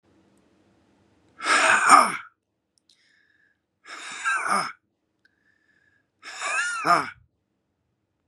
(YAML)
exhalation_length: 8.3 s
exhalation_amplitude: 30394
exhalation_signal_mean_std_ratio: 0.34
survey_phase: beta (2021-08-13 to 2022-03-07)
age: 45-64
gender: Male
wearing_mask: 'No'
symptom_none: true
smoker_status: Never smoked
respiratory_condition_asthma: false
respiratory_condition_other: false
recruitment_source: REACT
submission_delay: 2 days
covid_test_result: Negative
covid_test_method: RT-qPCR
influenza_a_test_result: Negative
influenza_b_test_result: Negative